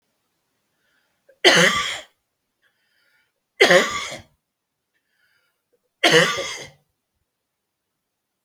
{"three_cough_length": "8.4 s", "three_cough_amplitude": 32766, "three_cough_signal_mean_std_ratio": 0.3, "survey_phase": "beta (2021-08-13 to 2022-03-07)", "age": "45-64", "gender": "Male", "wearing_mask": "No", "symptom_change_to_sense_of_smell_or_taste": true, "symptom_loss_of_taste": true, "smoker_status": "Never smoked", "respiratory_condition_asthma": false, "respiratory_condition_other": false, "recruitment_source": "Test and Trace", "submission_delay": "2 days", "covid_test_result": "Positive", "covid_test_method": "RT-qPCR", "covid_ct_value": 16.5, "covid_ct_gene": "ORF1ab gene"}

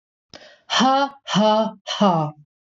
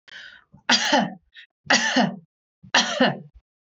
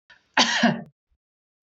{"exhalation_length": "2.7 s", "exhalation_amplitude": 18890, "exhalation_signal_mean_std_ratio": 0.59, "three_cough_length": "3.8 s", "three_cough_amplitude": 22999, "three_cough_signal_mean_std_ratio": 0.47, "cough_length": "1.6 s", "cough_amplitude": 21327, "cough_signal_mean_std_ratio": 0.39, "survey_phase": "beta (2021-08-13 to 2022-03-07)", "age": "45-64", "gender": "Female", "wearing_mask": "No", "symptom_none": true, "smoker_status": "Never smoked", "respiratory_condition_asthma": false, "respiratory_condition_other": false, "recruitment_source": "REACT", "submission_delay": "1 day", "covid_test_result": "Negative", "covid_test_method": "RT-qPCR"}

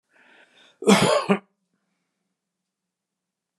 {"cough_length": "3.6 s", "cough_amplitude": 23960, "cough_signal_mean_std_ratio": 0.28, "survey_phase": "beta (2021-08-13 to 2022-03-07)", "age": "65+", "gender": "Male", "wearing_mask": "No", "symptom_none": true, "smoker_status": "Ex-smoker", "respiratory_condition_asthma": false, "respiratory_condition_other": false, "recruitment_source": "REACT", "submission_delay": "1 day", "covid_test_result": "Negative", "covid_test_method": "RT-qPCR"}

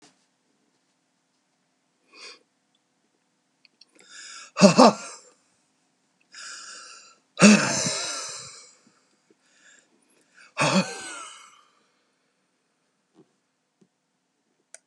{"exhalation_length": "14.9 s", "exhalation_amplitude": 31425, "exhalation_signal_mean_std_ratio": 0.23, "survey_phase": "beta (2021-08-13 to 2022-03-07)", "age": "65+", "gender": "Male", "wearing_mask": "No", "symptom_none": true, "smoker_status": "Ex-smoker", "respiratory_condition_asthma": false, "respiratory_condition_other": false, "recruitment_source": "REACT", "submission_delay": "2 days", "covid_test_result": "Negative", "covid_test_method": "RT-qPCR", "influenza_a_test_result": "Negative", "influenza_b_test_result": "Negative"}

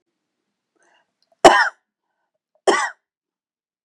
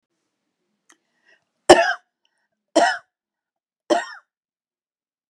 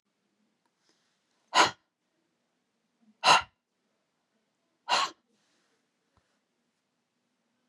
{"cough_length": "3.8 s", "cough_amplitude": 32768, "cough_signal_mean_std_ratio": 0.23, "three_cough_length": "5.3 s", "three_cough_amplitude": 32768, "three_cough_signal_mean_std_ratio": 0.22, "exhalation_length": "7.7 s", "exhalation_amplitude": 14689, "exhalation_signal_mean_std_ratio": 0.19, "survey_phase": "beta (2021-08-13 to 2022-03-07)", "age": "45-64", "gender": "Female", "wearing_mask": "No", "symptom_diarrhoea": true, "symptom_fatigue": true, "symptom_headache": true, "symptom_onset": "11 days", "smoker_status": "Ex-smoker", "respiratory_condition_asthma": false, "respiratory_condition_other": false, "recruitment_source": "REACT", "submission_delay": "1 day", "covid_test_result": "Negative", "covid_test_method": "RT-qPCR", "influenza_a_test_result": "Negative", "influenza_b_test_result": "Negative"}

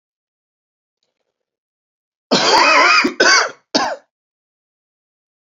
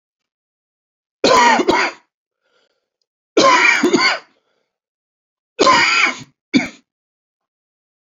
{"cough_length": "5.5 s", "cough_amplitude": 32279, "cough_signal_mean_std_ratio": 0.4, "three_cough_length": "8.1 s", "three_cough_amplitude": 32768, "three_cough_signal_mean_std_ratio": 0.42, "survey_phase": "beta (2021-08-13 to 2022-03-07)", "age": "45-64", "gender": "Male", "wearing_mask": "No", "symptom_fatigue": true, "symptom_onset": "4 days", "smoker_status": "Ex-smoker", "respiratory_condition_asthma": false, "respiratory_condition_other": false, "recruitment_source": "Test and Trace", "submission_delay": "2 days", "covid_test_result": "Positive", "covid_test_method": "RT-qPCR", "covid_ct_value": 16.7, "covid_ct_gene": "ORF1ab gene", "covid_ct_mean": 17.6, "covid_viral_load": "1700000 copies/ml", "covid_viral_load_category": "High viral load (>1M copies/ml)"}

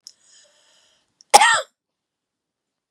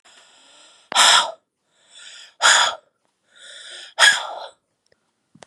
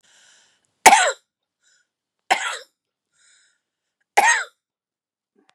{"cough_length": "2.9 s", "cough_amplitude": 32768, "cough_signal_mean_std_ratio": 0.22, "exhalation_length": "5.5 s", "exhalation_amplitude": 30115, "exhalation_signal_mean_std_ratio": 0.35, "three_cough_length": "5.5 s", "three_cough_amplitude": 32768, "three_cough_signal_mean_std_ratio": 0.25, "survey_phase": "beta (2021-08-13 to 2022-03-07)", "age": "45-64", "gender": "Female", "wearing_mask": "No", "symptom_runny_or_blocked_nose": true, "smoker_status": "Current smoker (11 or more cigarettes per day)", "respiratory_condition_asthma": true, "respiratory_condition_other": false, "recruitment_source": "REACT", "submission_delay": "1 day", "covid_test_result": "Negative", "covid_test_method": "RT-qPCR", "influenza_a_test_result": "Negative", "influenza_b_test_result": "Negative"}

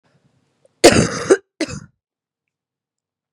{"cough_length": "3.3 s", "cough_amplitude": 32768, "cough_signal_mean_std_ratio": 0.27, "survey_phase": "beta (2021-08-13 to 2022-03-07)", "age": "18-44", "gender": "Female", "wearing_mask": "No", "symptom_cough_any": true, "symptom_runny_or_blocked_nose": true, "symptom_sore_throat": true, "symptom_fatigue": true, "symptom_headache": true, "symptom_other": true, "symptom_onset": "4 days", "smoker_status": "Prefer not to say", "respiratory_condition_asthma": false, "respiratory_condition_other": false, "recruitment_source": "Test and Trace", "submission_delay": "2 days", "covid_test_result": "Positive", "covid_test_method": "RT-qPCR"}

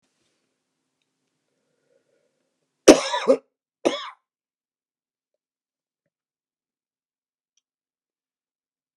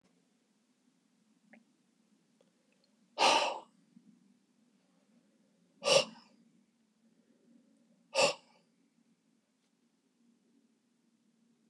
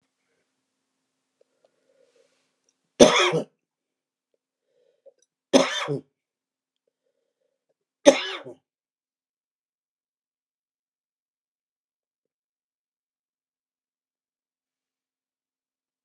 {"cough_length": "9.0 s", "cough_amplitude": 32768, "cough_signal_mean_std_ratio": 0.14, "exhalation_length": "11.7 s", "exhalation_amplitude": 8376, "exhalation_signal_mean_std_ratio": 0.21, "three_cough_length": "16.0 s", "three_cough_amplitude": 32768, "three_cough_signal_mean_std_ratio": 0.16, "survey_phase": "beta (2021-08-13 to 2022-03-07)", "age": "65+", "gender": "Male", "wearing_mask": "No", "symptom_cough_any": true, "symptom_runny_or_blocked_nose": true, "symptom_shortness_of_breath": true, "symptom_fatigue": true, "symptom_change_to_sense_of_smell_or_taste": true, "symptom_loss_of_taste": true, "symptom_onset": "6 days", "smoker_status": "Ex-smoker", "respiratory_condition_asthma": false, "respiratory_condition_other": true, "recruitment_source": "Test and Trace", "submission_delay": "2 days", "covid_test_result": "Positive", "covid_test_method": "RT-qPCR", "covid_ct_value": 18.5, "covid_ct_gene": "ORF1ab gene", "covid_ct_mean": 18.8, "covid_viral_load": "710000 copies/ml", "covid_viral_load_category": "Low viral load (10K-1M copies/ml)"}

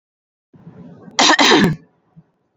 {"cough_length": "2.6 s", "cough_amplitude": 29743, "cough_signal_mean_std_ratio": 0.41, "survey_phase": "beta (2021-08-13 to 2022-03-07)", "age": "18-44", "gender": "Female", "wearing_mask": "No", "symptom_cough_any": true, "symptom_runny_or_blocked_nose": true, "symptom_onset": "3 days", "smoker_status": "Never smoked", "respiratory_condition_asthma": false, "respiratory_condition_other": false, "recruitment_source": "REACT", "submission_delay": "2 days", "covid_test_result": "Negative", "covid_test_method": "RT-qPCR", "influenza_a_test_result": "Negative", "influenza_b_test_result": "Negative"}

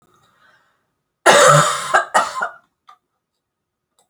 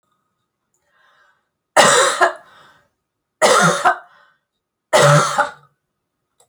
{"cough_length": "4.1 s", "cough_amplitude": 32768, "cough_signal_mean_std_ratio": 0.37, "three_cough_length": "6.5 s", "three_cough_amplitude": 32768, "three_cough_signal_mean_std_ratio": 0.4, "survey_phase": "beta (2021-08-13 to 2022-03-07)", "age": "65+", "gender": "Female", "wearing_mask": "No", "symptom_none": true, "smoker_status": "Never smoked", "respiratory_condition_asthma": false, "respiratory_condition_other": false, "recruitment_source": "REACT", "submission_delay": "4 days", "covid_test_result": "Negative", "covid_test_method": "RT-qPCR", "influenza_a_test_result": "Unknown/Void", "influenza_b_test_result": "Unknown/Void"}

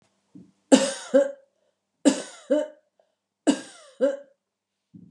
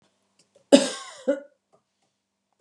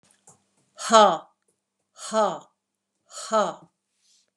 {"three_cough_length": "5.1 s", "three_cough_amplitude": 28661, "three_cough_signal_mean_std_ratio": 0.32, "cough_length": "2.6 s", "cough_amplitude": 31776, "cough_signal_mean_std_ratio": 0.22, "exhalation_length": "4.4 s", "exhalation_amplitude": 30042, "exhalation_signal_mean_std_ratio": 0.31, "survey_phase": "beta (2021-08-13 to 2022-03-07)", "age": "65+", "gender": "Female", "wearing_mask": "No", "symptom_none": true, "smoker_status": "Ex-smoker", "respiratory_condition_asthma": false, "respiratory_condition_other": false, "recruitment_source": "REACT", "submission_delay": "2 days", "covid_test_result": "Negative", "covid_test_method": "RT-qPCR", "influenza_a_test_result": "Unknown/Void", "influenza_b_test_result": "Unknown/Void"}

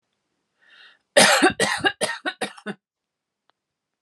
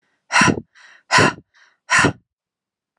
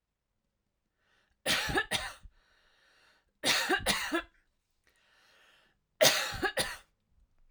{"cough_length": "4.0 s", "cough_amplitude": 29154, "cough_signal_mean_std_ratio": 0.35, "exhalation_length": "3.0 s", "exhalation_amplitude": 32043, "exhalation_signal_mean_std_ratio": 0.39, "three_cough_length": "7.5 s", "three_cough_amplitude": 12276, "three_cough_signal_mean_std_ratio": 0.38, "survey_phase": "alpha (2021-03-01 to 2021-08-12)", "age": "18-44", "gender": "Female", "wearing_mask": "No", "symptom_none": true, "smoker_status": "Ex-smoker", "respiratory_condition_asthma": false, "respiratory_condition_other": false, "recruitment_source": "REACT", "submission_delay": "1 day", "covid_test_result": "Negative", "covid_test_method": "RT-qPCR"}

